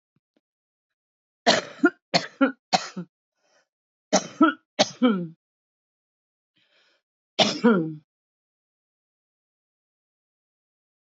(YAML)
cough_length: 11.1 s
cough_amplitude: 20873
cough_signal_mean_std_ratio: 0.28
survey_phase: beta (2021-08-13 to 2022-03-07)
age: 45-64
gender: Female
wearing_mask: 'Yes'
symptom_cough_any: true
symptom_runny_or_blocked_nose: true
symptom_fatigue: true
symptom_headache: true
symptom_loss_of_taste: true
symptom_other: true
smoker_status: Current smoker (e-cigarettes or vapes only)
respiratory_condition_asthma: false
respiratory_condition_other: false
recruitment_source: Test and Trace
submission_delay: 2 days
covid_test_result: Positive
covid_test_method: RT-qPCR
covid_ct_value: 19.3
covid_ct_gene: ORF1ab gene
covid_ct_mean: 19.7
covid_viral_load: 350000 copies/ml
covid_viral_load_category: Low viral load (10K-1M copies/ml)